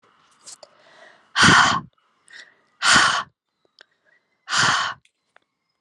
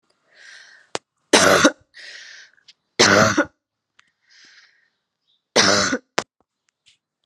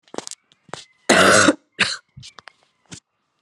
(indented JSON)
{
  "exhalation_length": "5.8 s",
  "exhalation_amplitude": 27578,
  "exhalation_signal_mean_std_ratio": 0.37,
  "three_cough_length": "7.3 s",
  "three_cough_amplitude": 32767,
  "three_cough_signal_mean_std_ratio": 0.33,
  "cough_length": "3.4 s",
  "cough_amplitude": 32767,
  "cough_signal_mean_std_ratio": 0.34,
  "survey_phase": "alpha (2021-03-01 to 2021-08-12)",
  "age": "18-44",
  "gender": "Female",
  "wearing_mask": "No",
  "symptom_cough_any": true,
  "symptom_new_continuous_cough": true,
  "symptom_abdominal_pain": true,
  "symptom_fatigue": true,
  "symptom_fever_high_temperature": true,
  "symptom_headache": true,
  "symptom_change_to_sense_of_smell_or_taste": true,
  "symptom_loss_of_taste": true,
  "symptom_onset": "2 days",
  "smoker_status": "Never smoked",
  "respiratory_condition_asthma": false,
  "respiratory_condition_other": false,
  "recruitment_source": "Test and Trace",
  "submission_delay": "1 day",
  "covid_test_result": "Positive",
  "covid_test_method": "RT-qPCR"
}